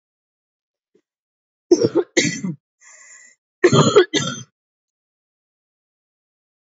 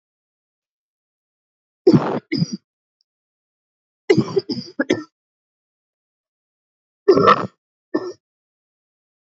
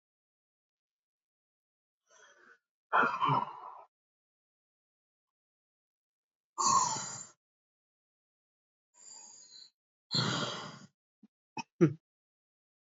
{"cough_length": "6.7 s", "cough_amplitude": 27467, "cough_signal_mean_std_ratio": 0.3, "three_cough_length": "9.3 s", "three_cough_amplitude": 28034, "three_cough_signal_mean_std_ratio": 0.27, "exhalation_length": "12.9 s", "exhalation_amplitude": 7879, "exhalation_signal_mean_std_ratio": 0.29, "survey_phase": "beta (2021-08-13 to 2022-03-07)", "age": "18-44", "gender": "Female", "wearing_mask": "No", "symptom_cough_any": true, "symptom_runny_or_blocked_nose": true, "symptom_headache": true, "symptom_onset": "4 days", "smoker_status": "Ex-smoker", "respiratory_condition_asthma": false, "respiratory_condition_other": false, "recruitment_source": "Test and Trace", "submission_delay": "1 day", "covid_test_result": "Positive", "covid_test_method": "RT-qPCR", "covid_ct_value": 18.3, "covid_ct_gene": "ORF1ab gene", "covid_ct_mean": 18.7, "covid_viral_load": "750000 copies/ml", "covid_viral_load_category": "Low viral load (10K-1M copies/ml)"}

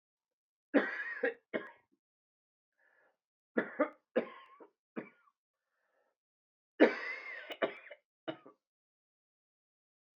{"three_cough_length": "10.2 s", "three_cough_amplitude": 9320, "three_cough_signal_mean_std_ratio": 0.26, "survey_phase": "beta (2021-08-13 to 2022-03-07)", "age": "45-64", "gender": "Male", "wearing_mask": "No", "symptom_cough_any": true, "symptom_new_continuous_cough": true, "symptom_runny_or_blocked_nose": true, "symptom_fatigue": true, "symptom_headache": true, "symptom_change_to_sense_of_smell_or_taste": true, "symptom_onset": "5 days", "smoker_status": "Never smoked", "respiratory_condition_asthma": false, "respiratory_condition_other": false, "recruitment_source": "Test and Trace", "submission_delay": "2 days", "covid_test_result": "Positive", "covid_test_method": "RT-qPCR"}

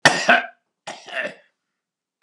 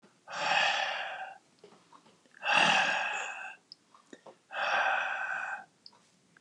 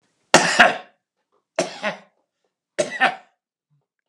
{"cough_length": "2.2 s", "cough_amplitude": 32768, "cough_signal_mean_std_ratio": 0.33, "exhalation_length": "6.4 s", "exhalation_amplitude": 8047, "exhalation_signal_mean_std_ratio": 0.57, "three_cough_length": "4.1 s", "three_cough_amplitude": 32768, "three_cough_signal_mean_std_ratio": 0.31, "survey_phase": "beta (2021-08-13 to 2022-03-07)", "age": "65+", "gender": "Male", "wearing_mask": "No", "symptom_none": true, "smoker_status": "Ex-smoker", "respiratory_condition_asthma": false, "respiratory_condition_other": false, "recruitment_source": "REACT", "submission_delay": "2 days", "covid_test_result": "Negative", "covid_test_method": "RT-qPCR", "influenza_a_test_result": "Negative", "influenza_b_test_result": "Negative"}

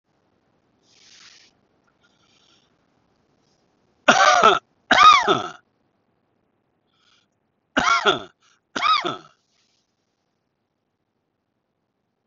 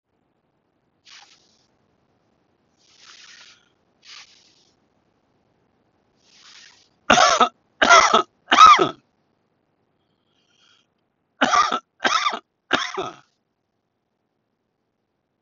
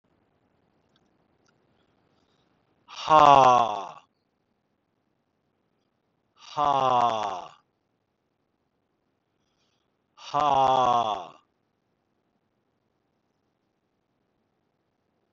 {"cough_length": "12.3 s", "cough_amplitude": 30328, "cough_signal_mean_std_ratio": 0.28, "three_cough_length": "15.4 s", "three_cough_amplitude": 31371, "three_cough_signal_mean_std_ratio": 0.26, "exhalation_length": "15.3 s", "exhalation_amplitude": 25210, "exhalation_signal_mean_std_ratio": 0.28, "survey_phase": "beta (2021-08-13 to 2022-03-07)", "age": "65+", "gender": "Male", "wearing_mask": "No", "symptom_none": true, "smoker_status": "Never smoked", "respiratory_condition_asthma": false, "respiratory_condition_other": false, "recruitment_source": "REACT", "submission_delay": "1 day", "covid_test_result": "Negative", "covid_test_method": "RT-qPCR", "influenza_a_test_result": "Negative", "influenza_b_test_result": "Negative"}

